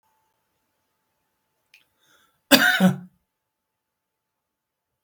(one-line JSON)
{"cough_length": "5.0 s", "cough_amplitude": 32768, "cough_signal_mean_std_ratio": 0.22, "survey_phase": "beta (2021-08-13 to 2022-03-07)", "age": "65+", "gender": "Male", "wearing_mask": "No", "symptom_none": true, "smoker_status": "Ex-smoker", "respiratory_condition_asthma": false, "respiratory_condition_other": false, "recruitment_source": "REACT", "submission_delay": "1 day", "covid_test_result": "Negative", "covid_test_method": "RT-qPCR", "influenza_a_test_result": "Negative", "influenza_b_test_result": "Negative"}